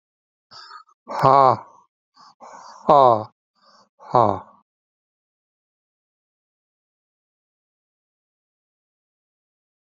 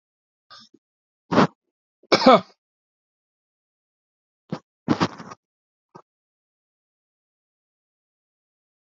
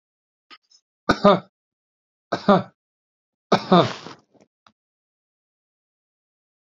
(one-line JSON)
{"exhalation_length": "9.8 s", "exhalation_amplitude": 28438, "exhalation_signal_mean_std_ratio": 0.22, "cough_length": "8.9 s", "cough_amplitude": 27843, "cough_signal_mean_std_ratio": 0.19, "three_cough_length": "6.7 s", "three_cough_amplitude": 28140, "three_cough_signal_mean_std_ratio": 0.24, "survey_phase": "alpha (2021-03-01 to 2021-08-12)", "age": "45-64", "gender": "Male", "wearing_mask": "No", "symptom_none": true, "smoker_status": "Ex-smoker", "respiratory_condition_asthma": false, "respiratory_condition_other": false, "recruitment_source": "REACT", "submission_delay": "3 days", "covid_test_result": "Negative", "covid_test_method": "RT-qPCR"}